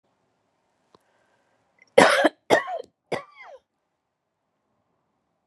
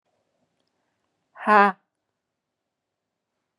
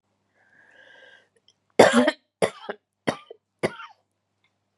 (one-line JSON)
{"cough_length": "5.5 s", "cough_amplitude": 32767, "cough_signal_mean_std_ratio": 0.23, "exhalation_length": "3.6 s", "exhalation_amplitude": 23810, "exhalation_signal_mean_std_ratio": 0.19, "three_cough_length": "4.8 s", "three_cough_amplitude": 31511, "three_cough_signal_mean_std_ratio": 0.24, "survey_phase": "beta (2021-08-13 to 2022-03-07)", "age": "45-64", "gender": "Female", "wearing_mask": "No", "symptom_none": true, "smoker_status": "Ex-smoker", "respiratory_condition_asthma": false, "respiratory_condition_other": false, "recruitment_source": "REACT", "submission_delay": "0 days", "covid_test_result": "Negative", "covid_test_method": "RT-qPCR"}